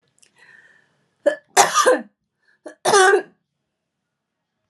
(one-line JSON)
{"cough_length": "4.7 s", "cough_amplitude": 32751, "cough_signal_mean_std_ratio": 0.34, "survey_phase": "alpha (2021-03-01 to 2021-08-12)", "age": "45-64", "gender": "Female", "wearing_mask": "No", "symptom_none": true, "smoker_status": "Never smoked", "respiratory_condition_asthma": false, "respiratory_condition_other": false, "recruitment_source": "REACT", "submission_delay": "1 day", "covid_test_result": "Negative", "covid_test_method": "RT-qPCR"}